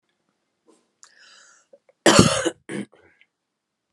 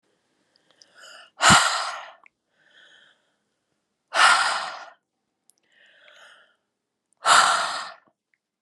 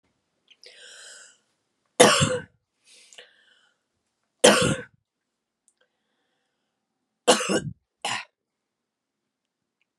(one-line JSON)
{"cough_length": "3.9 s", "cough_amplitude": 32768, "cough_signal_mean_std_ratio": 0.25, "exhalation_length": "8.6 s", "exhalation_amplitude": 30821, "exhalation_signal_mean_std_ratio": 0.33, "three_cough_length": "10.0 s", "three_cough_amplitude": 31566, "three_cough_signal_mean_std_ratio": 0.25, "survey_phase": "beta (2021-08-13 to 2022-03-07)", "age": "18-44", "gender": "Female", "wearing_mask": "No", "symptom_runny_or_blocked_nose": true, "symptom_abdominal_pain": true, "symptom_headache": true, "symptom_change_to_sense_of_smell_or_taste": true, "symptom_loss_of_taste": true, "symptom_onset": "5 days", "smoker_status": "Current smoker (1 to 10 cigarettes per day)", "respiratory_condition_asthma": false, "respiratory_condition_other": false, "recruitment_source": "Test and Trace", "submission_delay": "2 days", "covid_test_result": "Positive", "covid_test_method": "RT-qPCR"}